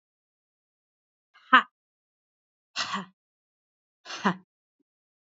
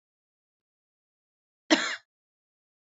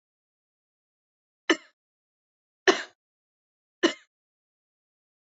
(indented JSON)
{
  "exhalation_length": "5.3 s",
  "exhalation_amplitude": 27145,
  "exhalation_signal_mean_std_ratio": 0.17,
  "cough_length": "2.9 s",
  "cough_amplitude": 19521,
  "cough_signal_mean_std_ratio": 0.18,
  "three_cough_length": "5.4 s",
  "three_cough_amplitude": 20162,
  "three_cough_signal_mean_std_ratio": 0.15,
  "survey_phase": "beta (2021-08-13 to 2022-03-07)",
  "age": "18-44",
  "gender": "Female",
  "wearing_mask": "Yes",
  "symptom_runny_or_blocked_nose": true,
  "smoker_status": "Never smoked",
  "respiratory_condition_asthma": false,
  "respiratory_condition_other": false,
  "recruitment_source": "Test and Trace",
  "submission_delay": "2 days",
  "covid_test_result": "Positive",
  "covid_test_method": "RT-qPCR",
  "covid_ct_value": 23.7,
  "covid_ct_gene": "N gene",
  "covid_ct_mean": 24.2,
  "covid_viral_load": "12000 copies/ml",
  "covid_viral_load_category": "Low viral load (10K-1M copies/ml)"
}